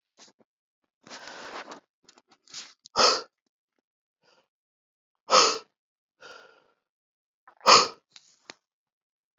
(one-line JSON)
{"exhalation_length": "9.4 s", "exhalation_amplitude": 24053, "exhalation_signal_mean_std_ratio": 0.22, "survey_phase": "beta (2021-08-13 to 2022-03-07)", "age": "45-64", "gender": "Male", "wearing_mask": "No", "symptom_cough_any": true, "symptom_sore_throat": true, "symptom_fever_high_temperature": true, "symptom_headache": true, "symptom_onset": "3 days", "smoker_status": "Never smoked", "respiratory_condition_asthma": false, "respiratory_condition_other": false, "recruitment_source": "Test and Trace", "submission_delay": "2 days", "covid_test_result": "Positive", "covid_test_method": "ePCR"}